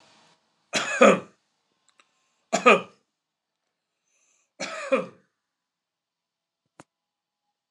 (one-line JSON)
{"three_cough_length": "7.7 s", "three_cough_amplitude": 27781, "three_cough_signal_mean_std_ratio": 0.23, "survey_phase": "alpha (2021-03-01 to 2021-08-12)", "age": "65+", "gender": "Male", "wearing_mask": "No", "symptom_none": true, "smoker_status": "Never smoked", "respiratory_condition_asthma": true, "respiratory_condition_other": false, "recruitment_source": "REACT", "submission_delay": "3 days", "covid_test_result": "Negative", "covid_test_method": "RT-qPCR"}